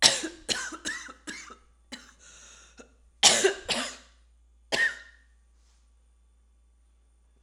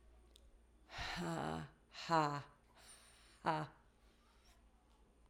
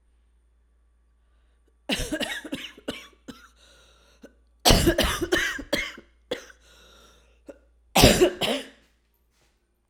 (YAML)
three_cough_length: 7.4 s
three_cough_amplitude: 28569
three_cough_signal_mean_std_ratio: 0.32
exhalation_length: 5.3 s
exhalation_amplitude: 2825
exhalation_signal_mean_std_ratio: 0.41
cough_length: 9.9 s
cough_amplitude: 27783
cough_signal_mean_std_ratio: 0.34
survey_phase: alpha (2021-03-01 to 2021-08-12)
age: 18-44
gender: Female
wearing_mask: 'No'
symptom_cough_any: true
symptom_fatigue: true
symptom_headache: true
smoker_status: Ex-smoker
respiratory_condition_asthma: false
respiratory_condition_other: false
recruitment_source: Test and Trace
submission_delay: 2 days
covid_test_result: Positive
covid_test_method: RT-qPCR
covid_ct_value: 21.3
covid_ct_gene: ORF1ab gene
covid_ct_mean: 22.0
covid_viral_load: 63000 copies/ml
covid_viral_load_category: Low viral load (10K-1M copies/ml)